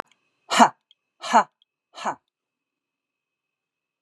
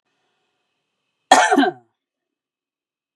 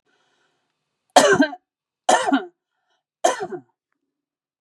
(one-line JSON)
{"exhalation_length": "4.0 s", "exhalation_amplitude": 30163, "exhalation_signal_mean_std_ratio": 0.22, "cough_length": "3.2 s", "cough_amplitude": 32768, "cough_signal_mean_std_ratio": 0.27, "three_cough_length": "4.6 s", "three_cough_amplitude": 32768, "three_cough_signal_mean_std_ratio": 0.32, "survey_phase": "beta (2021-08-13 to 2022-03-07)", "age": "45-64", "gender": "Female", "wearing_mask": "No", "symptom_none": true, "smoker_status": "Never smoked", "respiratory_condition_asthma": false, "respiratory_condition_other": false, "recruitment_source": "REACT", "submission_delay": "2 days", "covid_test_result": "Negative", "covid_test_method": "RT-qPCR", "influenza_a_test_result": "Negative", "influenza_b_test_result": "Negative"}